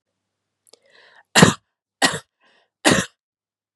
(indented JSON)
{
  "three_cough_length": "3.8 s",
  "three_cough_amplitude": 32768,
  "three_cough_signal_mean_std_ratio": 0.26,
  "survey_phase": "beta (2021-08-13 to 2022-03-07)",
  "age": "45-64",
  "gender": "Female",
  "wearing_mask": "No",
  "symptom_none": true,
  "smoker_status": "Ex-smoker",
  "respiratory_condition_asthma": false,
  "respiratory_condition_other": false,
  "recruitment_source": "REACT",
  "submission_delay": "2 days",
  "covid_test_result": "Negative",
  "covid_test_method": "RT-qPCR",
  "influenza_a_test_result": "Negative",
  "influenza_b_test_result": "Negative"
}